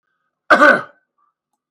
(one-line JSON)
{"cough_length": "1.7 s", "cough_amplitude": 32768, "cough_signal_mean_std_ratio": 0.33, "survey_phase": "beta (2021-08-13 to 2022-03-07)", "age": "65+", "gender": "Male", "wearing_mask": "No", "symptom_cough_any": true, "symptom_fatigue": true, "symptom_onset": "12 days", "smoker_status": "Never smoked", "respiratory_condition_asthma": false, "respiratory_condition_other": false, "recruitment_source": "REACT", "submission_delay": "2 days", "covid_test_result": "Negative", "covid_test_method": "RT-qPCR", "influenza_a_test_result": "Negative", "influenza_b_test_result": "Negative"}